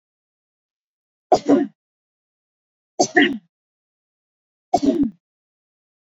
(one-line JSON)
{"three_cough_length": "6.1 s", "three_cough_amplitude": 27321, "three_cough_signal_mean_std_ratio": 0.28, "survey_phase": "beta (2021-08-13 to 2022-03-07)", "age": "18-44", "gender": "Female", "wearing_mask": "No", "symptom_none": true, "smoker_status": "Never smoked", "respiratory_condition_asthma": false, "respiratory_condition_other": false, "recruitment_source": "REACT", "submission_delay": "2 days", "covid_test_result": "Negative", "covid_test_method": "RT-qPCR", "influenza_a_test_result": "Negative", "influenza_b_test_result": "Negative"}